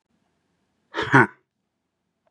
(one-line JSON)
{"exhalation_length": "2.3 s", "exhalation_amplitude": 28378, "exhalation_signal_mean_std_ratio": 0.23, "survey_phase": "beta (2021-08-13 to 2022-03-07)", "age": "45-64", "gender": "Male", "wearing_mask": "No", "symptom_cough_any": true, "symptom_runny_or_blocked_nose": true, "symptom_abdominal_pain": true, "symptom_fatigue": true, "symptom_headache": true, "symptom_onset": "5 days", "smoker_status": "Never smoked", "respiratory_condition_asthma": false, "respiratory_condition_other": false, "recruitment_source": "Test and Trace", "submission_delay": "1 day", "covid_test_result": "Positive", "covid_test_method": "RT-qPCR", "covid_ct_value": 18.4, "covid_ct_gene": "ORF1ab gene"}